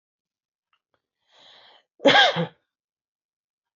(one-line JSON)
{"cough_length": "3.8 s", "cough_amplitude": 22130, "cough_signal_mean_std_ratio": 0.25, "survey_phase": "alpha (2021-03-01 to 2021-08-12)", "age": "45-64", "gender": "Female", "wearing_mask": "No", "symptom_none": true, "smoker_status": "Never smoked", "respiratory_condition_asthma": false, "respiratory_condition_other": false, "recruitment_source": "REACT", "submission_delay": "1 day", "covid_test_result": "Negative", "covid_test_method": "RT-qPCR"}